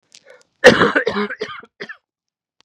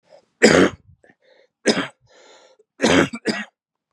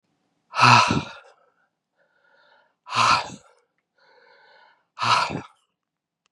{
  "cough_length": "2.6 s",
  "cough_amplitude": 32768,
  "cough_signal_mean_std_ratio": 0.34,
  "three_cough_length": "3.9 s",
  "three_cough_amplitude": 32556,
  "three_cough_signal_mean_std_ratio": 0.36,
  "exhalation_length": "6.3 s",
  "exhalation_amplitude": 30591,
  "exhalation_signal_mean_std_ratio": 0.33,
  "survey_phase": "beta (2021-08-13 to 2022-03-07)",
  "age": "18-44",
  "gender": "Male",
  "wearing_mask": "No",
  "symptom_cough_any": true,
  "symptom_new_continuous_cough": true,
  "symptom_runny_or_blocked_nose": true,
  "symptom_sore_throat": true,
  "symptom_fever_high_temperature": true,
  "symptom_onset": "2 days",
  "smoker_status": "Never smoked",
  "respiratory_condition_asthma": false,
  "respiratory_condition_other": false,
  "recruitment_source": "Test and Trace",
  "submission_delay": "1 day",
  "covid_test_result": "Positive",
  "covid_test_method": "ePCR"
}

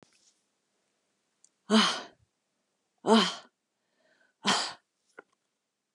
{
  "exhalation_length": "5.9 s",
  "exhalation_amplitude": 12850,
  "exhalation_signal_mean_std_ratio": 0.27,
  "survey_phase": "beta (2021-08-13 to 2022-03-07)",
  "age": "65+",
  "gender": "Female",
  "wearing_mask": "No",
  "symptom_none": true,
  "smoker_status": "Never smoked",
  "respiratory_condition_asthma": false,
  "respiratory_condition_other": false,
  "recruitment_source": "REACT",
  "submission_delay": "4 days",
  "covid_test_result": "Negative",
  "covid_test_method": "RT-qPCR",
  "influenza_a_test_result": "Negative",
  "influenza_b_test_result": "Negative"
}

